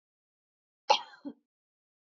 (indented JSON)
{
  "cough_length": "2.0 s",
  "cough_amplitude": 10634,
  "cough_signal_mean_std_ratio": 0.17,
  "survey_phase": "beta (2021-08-13 to 2022-03-07)",
  "age": "18-44",
  "gender": "Female",
  "wearing_mask": "No",
  "symptom_none": true,
  "smoker_status": "Never smoked",
  "respiratory_condition_asthma": true,
  "respiratory_condition_other": false,
  "recruitment_source": "REACT",
  "submission_delay": "1 day",
  "covid_test_result": "Negative",
  "covid_test_method": "RT-qPCR",
  "influenza_a_test_result": "Negative",
  "influenza_b_test_result": "Negative"
}